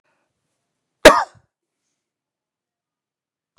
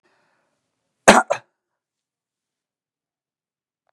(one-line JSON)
{"three_cough_length": "3.6 s", "three_cough_amplitude": 32768, "three_cough_signal_mean_std_ratio": 0.15, "cough_length": "3.9 s", "cough_amplitude": 32768, "cough_signal_mean_std_ratio": 0.15, "survey_phase": "beta (2021-08-13 to 2022-03-07)", "age": "45-64", "gender": "Male", "wearing_mask": "No", "symptom_none": true, "smoker_status": "Ex-smoker", "respiratory_condition_asthma": false, "respiratory_condition_other": false, "recruitment_source": "REACT", "submission_delay": "3 days", "covid_test_result": "Negative", "covid_test_method": "RT-qPCR", "influenza_a_test_result": "Unknown/Void", "influenza_b_test_result": "Unknown/Void"}